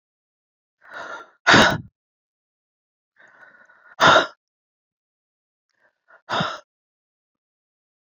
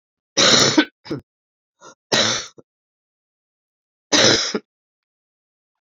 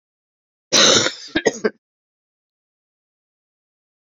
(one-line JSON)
{"exhalation_length": "8.1 s", "exhalation_amplitude": 32678, "exhalation_signal_mean_std_ratio": 0.24, "three_cough_length": "5.9 s", "three_cough_amplitude": 30813, "three_cough_signal_mean_std_ratio": 0.36, "cough_length": "4.2 s", "cough_amplitude": 31687, "cough_signal_mean_std_ratio": 0.29, "survey_phase": "beta (2021-08-13 to 2022-03-07)", "age": "65+", "gender": "Female", "wearing_mask": "No", "symptom_cough_any": true, "symptom_runny_or_blocked_nose": true, "smoker_status": "Never smoked", "respiratory_condition_asthma": false, "respiratory_condition_other": false, "recruitment_source": "Test and Trace", "submission_delay": "2 days", "covid_test_result": "Positive", "covid_test_method": "RT-qPCR"}